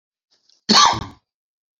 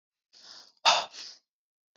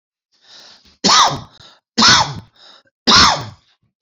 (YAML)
cough_length: 1.8 s
cough_amplitude: 30924
cough_signal_mean_std_ratio: 0.33
exhalation_length: 2.0 s
exhalation_amplitude: 13821
exhalation_signal_mean_std_ratio: 0.27
three_cough_length: 4.0 s
three_cough_amplitude: 32768
three_cough_signal_mean_std_ratio: 0.42
survey_phase: beta (2021-08-13 to 2022-03-07)
age: 45-64
gender: Male
wearing_mask: 'No'
symptom_cough_any: true
symptom_runny_or_blocked_nose: true
symptom_change_to_sense_of_smell_or_taste: true
symptom_onset: 4 days
smoker_status: Never smoked
respiratory_condition_asthma: false
respiratory_condition_other: false
recruitment_source: Test and Trace
submission_delay: 2 days
covid_test_result: Positive
covid_test_method: RT-qPCR
covid_ct_value: 16.0
covid_ct_gene: N gene
covid_ct_mean: 16.3
covid_viral_load: 4600000 copies/ml
covid_viral_load_category: High viral load (>1M copies/ml)